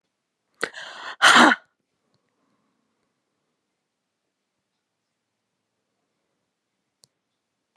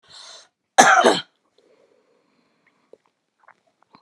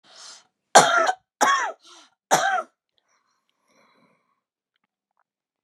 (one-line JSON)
{"exhalation_length": "7.8 s", "exhalation_amplitude": 32297, "exhalation_signal_mean_std_ratio": 0.18, "cough_length": "4.0 s", "cough_amplitude": 32768, "cough_signal_mean_std_ratio": 0.25, "three_cough_length": "5.6 s", "three_cough_amplitude": 32463, "three_cough_signal_mean_std_ratio": 0.31, "survey_phase": "beta (2021-08-13 to 2022-03-07)", "age": "45-64", "gender": "Female", "wearing_mask": "No", "symptom_headache": true, "smoker_status": "Ex-smoker", "respiratory_condition_asthma": false, "respiratory_condition_other": false, "recruitment_source": "REACT", "submission_delay": "2 days", "covid_test_result": "Negative", "covid_test_method": "RT-qPCR", "influenza_a_test_result": "Negative", "influenza_b_test_result": "Negative"}